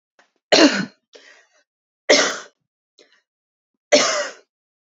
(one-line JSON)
{"three_cough_length": "4.9 s", "three_cough_amplitude": 30642, "three_cough_signal_mean_std_ratio": 0.32, "survey_phase": "beta (2021-08-13 to 2022-03-07)", "age": "18-44", "gender": "Female", "wearing_mask": "No", "symptom_cough_any": true, "symptom_runny_or_blocked_nose": true, "symptom_headache": true, "symptom_change_to_sense_of_smell_or_taste": true, "symptom_loss_of_taste": true, "symptom_onset": "6 days", "smoker_status": "Never smoked", "respiratory_condition_asthma": false, "respiratory_condition_other": false, "recruitment_source": "Test and Trace", "submission_delay": "2 days", "covid_test_result": "Positive", "covid_test_method": "RT-qPCR", "covid_ct_value": 16.7, "covid_ct_gene": "ORF1ab gene", "covid_ct_mean": 17.2, "covid_viral_load": "2400000 copies/ml", "covid_viral_load_category": "High viral load (>1M copies/ml)"}